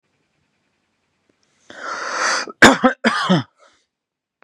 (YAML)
cough_length: 4.4 s
cough_amplitude: 32768
cough_signal_mean_std_ratio: 0.34
survey_phase: beta (2021-08-13 to 2022-03-07)
age: 18-44
gender: Male
wearing_mask: 'No'
symptom_none: true
smoker_status: Never smoked
respiratory_condition_asthma: false
respiratory_condition_other: false
recruitment_source: REACT
submission_delay: 10 days
covid_test_result: Negative
covid_test_method: RT-qPCR
influenza_a_test_result: Negative
influenza_b_test_result: Negative